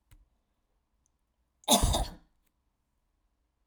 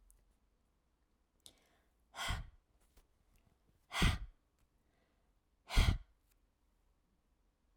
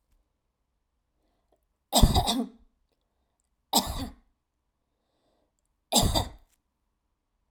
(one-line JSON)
{"cough_length": "3.7 s", "cough_amplitude": 11432, "cough_signal_mean_std_ratio": 0.25, "exhalation_length": "7.8 s", "exhalation_amplitude": 4361, "exhalation_signal_mean_std_ratio": 0.23, "three_cough_length": "7.5 s", "three_cough_amplitude": 17176, "three_cough_signal_mean_std_ratio": 0.28, "survey_phase": "beta (2021-08-13 to 2022-03-07)", "age": "45-64", "gender": "Female", "wearing_mask": "No", "symptom_sore_throat": true, "symptom_fatigue": true, "symptom_onset": "4 days", "smoker_status": "Never smoked", "respiratory_condition_asthma": false, "respiratory_condition_other": false, "recruitment_source": "REACT", "submission_delay": "1 day", "covid_test_result": "Negative", "covid_test_method": "RT-qPCR"}